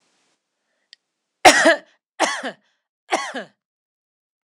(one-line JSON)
{"three_cough_length": "4.5 s", "three_cough_amplitude": 26028, "three_cough_signal_mean_std_ratio": 0.27, "survey_phase": "alpha (2021-03-01 to 2021-08-12)", "age": "45-64", "gender": "Female", "wearing_mask": "No", "symptom_none": true, "smoker_status": "Ex-smoker", "respiratory_condition_asthma": false, "respiratory_condition_other": false, "recruitment_source": "REACT", "submission_delay": "2 days", "covid_test_result": "Negative", "covid_test_method": "RT-qPCR"}